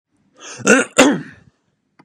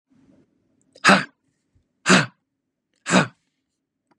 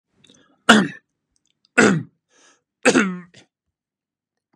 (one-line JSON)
{"cough_length": "2.0 s", "cough_amplitude": 32768, "cough_signal_mean_std_ratio": 0.37, "exhalation_length": "4.2 s", "exhalation_amplitude": 32767, "exhalation_signal_mean_std_ratio": 0.27, "three_cough_length": "4.6 s", "three_cough_amplitude": 32768, "three_cough_signal_mean_std_ratio": 0.3, "survey_phase": "beta (2021-08-13 to 2022-03-07)", "age": "18-44", "gender": "Male", "wearing_mask": "No", "symptom_none": true, "smoker_status": "Never smoked", "respiratory_condition_asthma": false, "respiratory_condition_other": false, "recruitment_source": "REACT", "submission_delay": "3 days", "covid_test_result": "Negative", "covid_test_method": "RT-qPCR", "influenza_a_test_result": "Negative", "influenza_b_test_result": "Negative"}